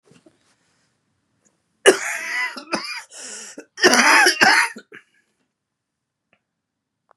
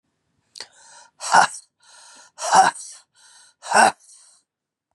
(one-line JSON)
{"cough_length": "7.2 s", "cough_amplitude": 32768, "cough_signal_mean_std_ratio": 0.35, "exhalation_length": "4.9 s", "exhalation_amplitude": 30398, "exhalation_signal_mean_std_ratio": 0.31, "survey_phase": "beta (2021-08-13 to 2022-03-07)", "age": "45-64", "gender": "Male", "wearing_mask": "No", "symptom_cough_any": true, "symptom_new_continuous_cough": true, "symptom_fatigue": true, "symptom_fever_high_temperature": true, "symptom_headache": true, "symptom_change_to_sense_of_smell_or_taste": true, "symptom_loss_of_taste": true, "smoker_status": "Never smoked", "respiratory_condition_asthma": false, "respiratory_condition_other": false, "recruitment_source": "Test and Trace", "submission_delay": "1 day", "covid_test_result": "Positive", "covid_test_method": "RT-qPCR", "covid_ct_value": 24.0, "covid_ct_gene": "ORF1ab gene", "covid_ct_mean": 24.8, "covid_viral_load": "7400 copies/ml", "covid_viral_load_category": "Minimal viral load (< 10K copies/ml)"}